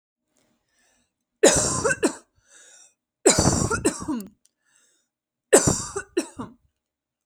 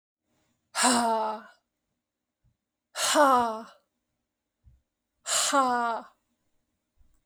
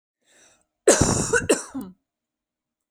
{"three_cough_length": "7.3 s", "three_cough_amplitude": 29882, "three_cough_signal_mean_std_ratio": 0.37, "exhalation_length": "7.3 s", "exhalation_amplitude": 12625, "exhalation_signal_mean_std_ratio": 0.41, "cough_length": "2.9 s", "cough_amplitude": 30252, "cough_signal_mean_std_ratio": 0.37, "survey_phase": "beta (2021-08-13 to 2022-03-07)", "age": "18-44", "gender": "Female", "wearing_mask": "No", "symptom_none": true, "smoker_status": "Never smoked", "respiratory_condition_asthma": false, "respiratory_condition_other": false, "recruitment_source": "REACT", "submission_delay": "1 day", "covid_test_result": "Negative", "covid_test_method": "RT-qPCR"}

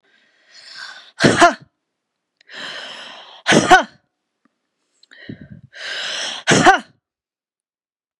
{"three_cough_length": "8.2 s", "three_cough_amplitude": 32768, "three_cough_signal_mean_std_ratio": 0.32, "survey_phase": "beta (2021-08-13 to 2022-03-07)", "age": "65+", "gender": "Female", "wearing_mask": "No", "symptom_none": true, "symptom_onset": "12 days", "smoker_status": "Ex-smoker", "respiratory_condition_asthma": false, "respiratory_condition_other": false, "recruitment_source": "REACT", "submission_delay": "3 days", "covid_test_result": "Negative", "covid_test_method": "RT-qPCR", "influenza_a_test_result": "Negative", "influenza_b_test_result": "Negative"}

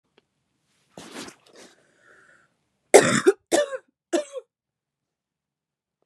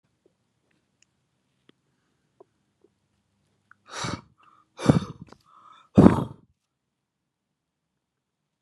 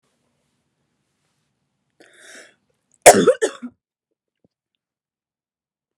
{"three_cough_length": "6.1 s", "three_cough_amplitude": 32767, "three_cough_signal_mean_std_ratio": 0.23, "exhalation_length": "8.6 s", "exhalation_amplitude": 32767, "exhalation_signal_mean_std_ratio": 0.17, "cough_length": "6.0 s", "cough_amplitude": 32768, "cough_signal_mean_std_ratio": 0.17, "survey_phase": "beta (2021-08-13 to 2022-03-07)", "age": "18-44", "gender": "Female", "wearing_mask": "No", "symptom_sore_throat": true, "symptom_fatigue": true, "symptom_headache": true, "smoker_status": "Current smoker (e-cigarettes or vapes only)", "respiratory_condition_asthma": false, "respiratory_condition_other": false, "recruitment_source": "Test and Trace", "submission_delay": "2 days", "covid_test_result": "Positive", "covid_test_method": "RT-qPCR", "covid_ct_value": 29.9, "covid_ct_gene": "N gene", "covid_ct_mean": 30.0, "covid_viral_load": "140 copies/ml", "covid_viral_load_category": "Minimal viral load (< 10K copies/ml)"}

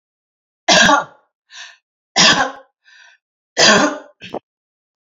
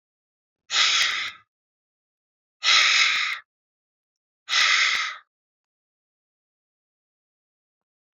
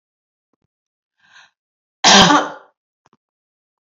{"three_cough_length": "5.0 s", "three_cough_amplitude": 32768, "three_cough_signal_mean_std_ratio": 0.38, "exhalation_length": "8.2 s", "exhalation_amplitude": 17041, "exhalation_signal_mean_std_ratio": 0.39, "cough_length": "3.8 s", "cough_amplitude": 32550, "cough_signal_mean_std_ratio": 0.27, "survey_phase": "beta (2021-08-13 to 2022-03-07)", "age": "45-64", "gender": "Female", "wearing_mask": "No", "symptom_none": true, "smoker_status": "Never smoked", "respiratory_condition_asthma": false, "respiratory_condition_other": false, "recruitment_source": "REACT", "submission_delay": "2 days", "covid_test_result": "Negative", "covid_test_method": "RT-qPCR", "influenza_a_test_result": "Negative", "influenza_b_test_result": "Negative"}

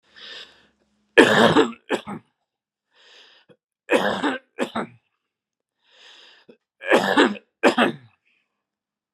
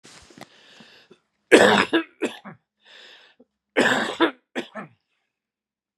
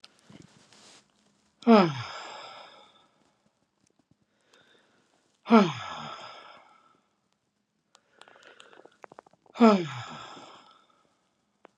{"three_cough_length": "9.1 s", "three_cough_amplitude": 32768, "three_cough_signal_mean_std_ratio": 0.34, "cough_length": "6.0 s", "cough_amplitude": 32767, "cough_signal_mean_std_ratio": 0.32, "exhalation_length": "11.8 s", "exhalation_amplitude": 21151, "exhalation_signal_mean_std_ratio": 0.23, "survey_phase": "beta (2021-08-13 to 2022-03-07)", "age": "65+", "gender": "Male", "wearing_mask": "No", "symptom_cough_any": true, "symptom_runny_or_blocked_nose": true, "symptom_shortness_of_breath": true, "symptom_fatigue": true, "symptom_onset": "2 days", "smoker_status": "Never smoked", "respiratory_condition_asthma": false, "respiratory_condition_other": false, "recruitment_source": "Test and Trace", "submission_delay": "1 day", "covid_test_result": "Positive", "covid_test_method": "RT-qPCR"}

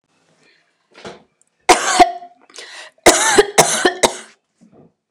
{"three_cough_length": "5.1 s", "three_cough_amplitude": 29204, "three_cough_signal_mean_std_ratio": 0.37, "survey_phase": "beta (2021-08-13 to 2022-03-07)", "age": "18-44", "gender": "Female", "wearing_mask": "Yes", "symptom_none": true, "smoker_status": "Ex-smoker", "respiratory_condition_asthma": false, "respiratory_condition_other": false, "recruitment_source": "REACT", "submission_delay": "0 days", "covid_test_result": "Negative", "covid_test_method": "RT-qPCR", "influenza_a_test_result": "Negative", "influenza_b_test_result": "Negative"}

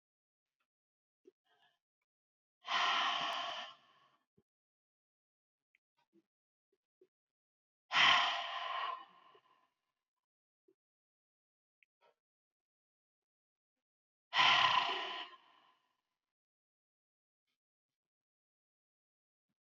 {"exhalation_length": "19.6 s", "exhalation_amplitude": 5216, "exhalation_signal_mean_std_ratio": 0.27, "survey_phase": "beta (2021-08-13 to 2022-03-07)", "age": "65+", "gender": "Female", "wearing_mask": "No", "symptom_headache": true, "smoker_status": "Ex-smoker", "respiratory_condition_asthma": false, "respiratory_condition_other": false, "recruitment_source": "REACT", "submission_delay": "2 days", "covid_test_result": "Negative", "covid_test_method": "RT-qPCR", "influenza_a_test_result": "Negative", "influenza_b_test_result": "Negative"}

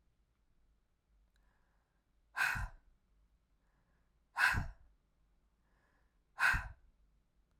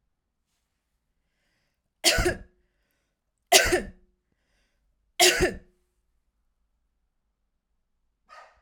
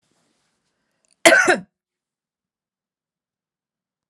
{"exhalation_length": "7.6 s", "exhalation_amplitude": 4620, "exhalation_signal_mean_std_ratio": 0.28, "three_cough_length": "8.6 s", "three_cough_amplitude": 32767, "three_cough_signal_mean_std_ratio": 0.25, "cough_length": "4.1 s", "cough_amplitude": 32768, "cough_signal_mean_std_ratio": 0.21, "survey_phase": "alpha (2021-03-01 to 2021-08-12)", "age": "18-44", "gender": "Female", "wearing_mask": "No", "symptom_none": true, "smoker_status": "Never smoked", "respiratory_condition_asthma": false, "respiratory_condition_other": false, "recruitment_source": "REACT", "submission_delay": "1 day", "covid_test_result": "Negative", "covid_test_method": "RT-qPCR"}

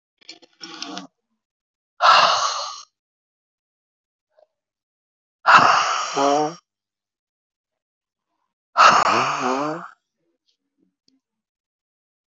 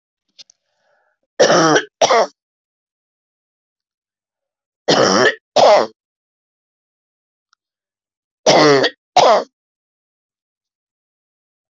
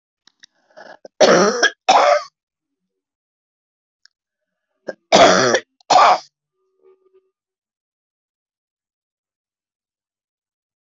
{"exhalation_length": "12.3 s", "exhalation_amplitude": 26585, "exhalation_signal_mean_std_ratio": 0.35, "three_cough_length": "11.8 s", "three_cough_amplitude": 28827, "three_cough_signal_mean_std_ratio": 0.35, "cough_length": "10.8 s", "cough_amplitude": 28147, "cough_signal_mean_std_ratio": 0.3, "survey_phase": "alpha (2021-03-01 to 2021-08-12)", "age": "65+", "gender": "Female", "wearing_mask": "No", "symptom_none": true, "smoker_status": "Ex-smoker", "respiratory_condition_asthma": false, "respiratory_condition_other": false, "recruitment_source": "REACT", "submission_delay": "4 days", "covid_test_result": "Negative", "covid_test_method": "RT-qPCR"}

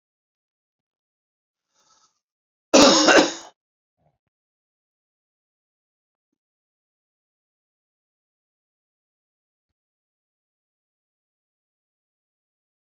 {"cough_length": "12.9 s", "cough_amplitude": 28321, "cough_signal_mean_std_ratio": 0.16, "survey_phase": "beta (2021-08-13 to 2022-03-07)", "age": "45-64", "gender": "Male", "wearing_mask": "No", "symptom_none": true, "smoker_status": "Ex-smoker", "respiratory_condition_asthma": false, "respiratory_condition_other": false, "recruitment_source": "REACT", "submission_delay": "1 day", "covid_test_result": "Negative", "covid_test_method": "RT-qPCR"}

